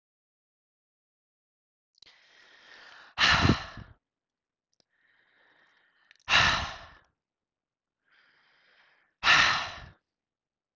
{"exhalation_length": "10.8 s", "exhalation_amplitude": 12386, "exhalation_signal_mean_std_ratio": 0.28, "survey_phase": "beta (2021-08-13 to 2022-03-07)", "age": "18-44", "gender": "Female", "wearing_mask": "No", "symptom_none": true, "symptom_onset": "9 days", "smoker_status": "Ex-smoker", "respiratory_condition_asthma": false, "respiratory_condition_other": false, "recruitment_source": "REACT", "submission_delay": "1 day", "covid_test_result": "Negative", "covid_test_method": "RT-qPCR"}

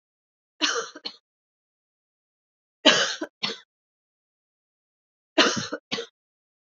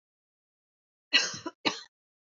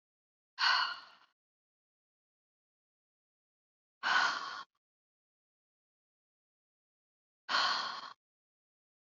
{"three_cough_length": "6.7 s", "three_cough_amplitude": 26404, "three_cough_signal_mean_std_ratio": 0.28, "cough_length": "2.4 s", "cough_amplitude": 12611, "cough_signal_mean_std_ratio": 0.26, "exhalation_length": "9.0 s", "exhalation_amplitude": 4612, "exhalation_signal_mean_std_ratio": 0.3, "survey_phase": "beta (2021-08-13 to 2022-03-07)", "age": "45-64", "gender": "Female", "wearing_mask": "No", "symptom_none": true, "symptom_onset": "13 days", "smoker_status": "Never smoked", "respiratory_condition_asthma": false, "respiratory_condition_other": false, "recruitment_source": "REACT", "submission_delay": "3 days", "covid_test_result": "Negative", "covid_test_method": "RT-qPCR", "influenza_a_test_result": "Negative", "influenza_b_test_result": "Negative"}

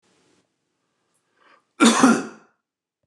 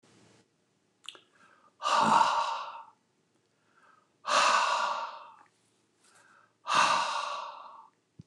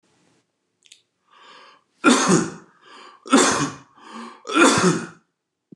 {"cough_length": "3.1 s", "cough_amplitude": 29164, "cough_signal_mean_std_ratio": 0.29, "exhalation_length": "8.3 s", "exhalation_amplitude": 9089, "exhalation_signal_mean_std_ratio": 0.45, "three_cough_length": "5.8 s", "three_cough_amplitude": 27243, "three_cough_signal_mean_std_ratio": 0.4, "survey_phase": "beta (2021-08-13 to 2022-03-07)", "age": "65+", "gender": "Male", "wearing_mask": "No", "symptom_none": true, "smoker_status": "Never smoked", "respiratory_condition_asthma": false, "respiratory_condition_other": false, "recruitment_source": "REACT", "submission_delay": "2 days", "covid_test_result": "Negative", "covid_test_method": "RT-qPCR", "influenza_a_test_result": "Negative", "influenza_b_test_result": "Negative"}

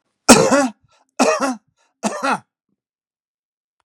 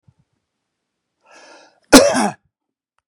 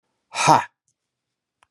{"three_cough_length": "3.8 s", "three_cough_amplitude": 32768, "three_cough_signal_mean_std_ratio": 0.36, "cough_length": "3.1 s", "cough_amplitude": 32768, "cough_signal_mean_std_ratio": 0.25, "exhalation_length": "1.7 s", "exhalation_amplitude": 30232, "exhalation_signal_mean_std_ratio": 0.28, "survey_phase": "beta (2021-08-13 to 2022-03-07)", "age": "65+", "gender": "Male", "wearing_mask": "No", "symptom_cough_any": true, "symptom_sore_throat": true, "symptom_fatigue": true, "symptom_headache": true, "symptom_onset": "3 days", "smoker_status": "Never smoked", "respiratory_condition_asthma": false, "respiratory_condition_other": false, "recruitment_source": "REACT", "submission_delay": "2 days", "covid_test_result": "Positive", "covid_test_method": "RT-qPCR", "covid_ct_value": 23.0, "covid_ct_gene": "E gene", "influenza_a_test_result": "Negative", "influenza_b_test_result": "Negative"}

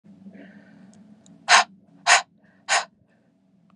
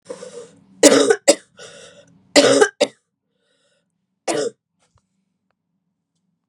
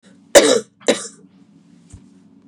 {"exhalation_length": "3.8 s", "exhalation_amplitude": 30299, "exhalation_signal_mean_std_ratio": 0.28, "three_cough_length": "6.5 s", "three_cough_amplitude": 32768, "three_cough_signal_mean_std_ratio": 0.3, "cough_length": "2.5 s", "cough_amplitude": 32768, "cough_signal_mean_std_ratio": 0.3, "survey_phase": "beta (2021-08-13 to 2022-03-07)", "age": "45-64", "gender": "Female", "wearing_mask": "No", "symptom_cough_any": true, "symptom_runny_or_blocked_nose": true, "symptom_shortness_of_breath": true, "symptom_sore_throat": true, "symptom_fatigue": true, "symptom_fever_high_temperature": true, "symptom_headache": true, "symptom_other": true, "symptom_onset": "3 days", "smoker_status": "Never smoked", "respiratory_condition_asthma": false, "respiratory_condition_other": false, "recruitment_source": "Test and Trace", "submission_delay": "1 day", "covid_test_result": "Positive", "covid_test_method": "RT-qPCR", "covid_ct_value": 15.9, "covid_ct_gene": "ORF1ab gene", "covid_ct_mean": 16.3, "covid_viral_load": "4500000 copies/ml", "covid_viral_load_category": "High viral load (>1M copies/ml)"}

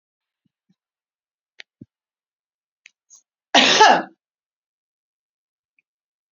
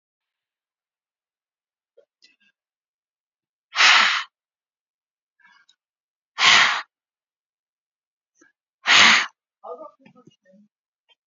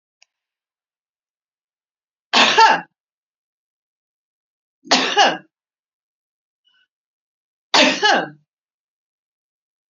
{"cough_length": "6.3 s", "cough_amplitude": 30768, "cough_signal_mean_std_ratio": 0.21, "exhalation_length": "11.3 s", "exhalation_amplitude": 28281, "exhalation_signal_mean_std_ratio": 0.26, "three_cough_length": "9.9 s", "three_cough_amplitude": 32767, "three_cough_signal_mean_std_ratio": 0.28, "survey_phase": "beta (2021-08-13 to 2022-03-07)", "age": "45-64", "gender": "Female", "wearing_mask": "No", "symptom_none": true, "smoker_status": "Current smoker (1 to 10 cigarettes per day)", "respiratory_condition_asthma": true, "respiratory_condition_other": false, "recruitment_source": "REACT", "submission_delay": "2 days", "covid_test_result": "Negative", "covid_test_method": "RT-qPCR", "influenza_a_test_result": "Negative", "influenza_b_test_result": "Negative"}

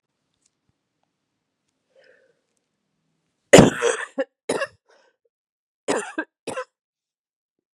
{"cough_length": "7.8 s", "cough_amplitude": 32768, "cough_signal_mean_std_ratio": 0.2, "survey_phase": "beta (2021-08-13 to 2022-03-07)", "age": "18-44", "gender": "Female", "wearing_mask": "No", "symptom_cough_any": true, "symptom_runny_or_blocked_nose": true, "symptom_headache": true, "symptom_change_to_sense_of_smell_or_taste": true, "symptom_onset": "4 days", "smoker_status": "Never smoked", "respiratory_condition_asthma": false, "respiratory_condition_other": false, "recruitment_source": "Test and Trace", "submission_delay": "1 day", "covid_test_result": "Positive", "covid_test_method": "RT-qPCR", "covid_ct_value": 22.6, "covid_ct_gene": "N gene"}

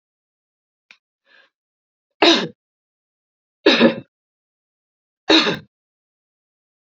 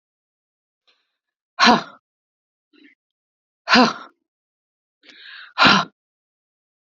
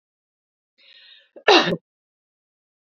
{"three_cough_length": "6.9 s", "three_cough_amplitude": 31395, "three_cough_signal_mean_std_ratio": 0.26, "exhalation_length": "7.0 s", "exhalation_amplitude": 31824, "exhalation_signal_mean_std_ratio": 0.25, "cough_length": "3.0 s", "cough_amplitude": 28993, "cough_signal_mean_std_ratio": 0.22, "survey_phase": "beta (2021-08-13 to 2022-03-07)", "age": "45-64", "gender": "Female", "wearing_mask": "No", "symptom_none": true, "smoker_status": "Never smoked", "respiratory_condition_asthma": false, "respiratory_condition_other": false, "recruitment_source": "REACT", "submission_delay": "1 day", "covid_test_result": "Negative", "covid_test_method": "RT-qPCR", "influenza_a_test_result": "Negative", "influenza_b_test_result": "Negative"}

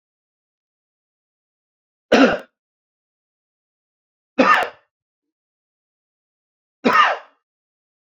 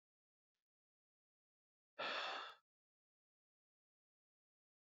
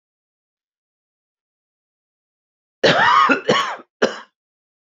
{"three_cough_length": "8.2 s", "three_cough_amplitude": 28361, "three_cough_signal_mean_std_ratio": 0.25, "exhalation_length": "4.9 s", "exhalation_amplitude": 712, "exhalation_signal_mean_std_ratio": 0.26, "cough_length": "4.9 s", "cough_amplitude": 27099, "cough_signal_mean_std_ratio": 0.35, "survey_phase": "beta (2021-08-13 to 2022-03-07)", "age": "45-64", "gender": "Male", "wearing_mask": "No", "symptom_none": true, "smoker_status": "Never smoked", "respiratory_condition_asthma": false, "respiratory_condition_other": false, "recruitment_source": "REACT", "submission_delay": "1 day", "covid_test_result": "Negative", "covid_test_method": "RT-qPCR", "influenza_a_test_result": "Negative", "influenza_b_test_result": "Negative"}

